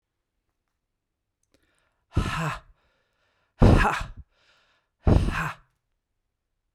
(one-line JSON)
{"exhalation_length": "6.7 s", "exhalation_amplitude": 22889, "exhalation_signal_mean_std_ratio": 0.3, "survey_phase": "beta (2021-08-13 to 2022-03-07)", "age": "65+", "gender": "Female", "wearing_mask": "No", "symptom_runny_or_blocked_nose": true, "symptom_onset": "9 days", "smoker_status": "Never smoked", "respiratory_condition_asthma": false, "respiratory_condition_other": false, "recruitment_source": "REACT", "submission_delay": "1 day", "covid_test_result": "Negative", "covid_test_method": "RT-qPCR"}